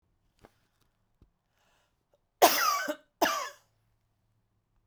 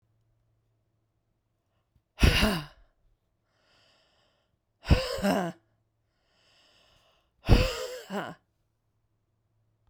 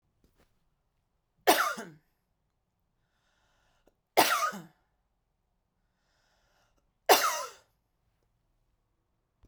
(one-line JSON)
{"cough_length": "4.9 s", "cough_amplitude": 18634, "cough_signal_mean_std_ratio": 0.28, "exhalation_length": "9.9 s", "exhalation_amplitude": 18700, "exhalation_signal_mean_std_ratio": 0.28, "three_cough_length": "9.5 s", "three_cough_amplitude": 17593, "three_cough_signal_mean_std_ratio": 0.23, "survey_phase": "beta (2021-08-13 to 2022-03-07)", "age": "45-64", "gender": "Female", "wearing_mask": "No", "symptom_abdominal_pain": true, "symptom_onset": "4 days", "smoker_status": "Never smoked", "respiratory_condition_asthma": false, "respiratory_condition_other": false, "recruitment_source": "REACT", "submission_delay": "1 day", "covid_test_result": "Negative", "covid_test_method": "RT-qPCR"}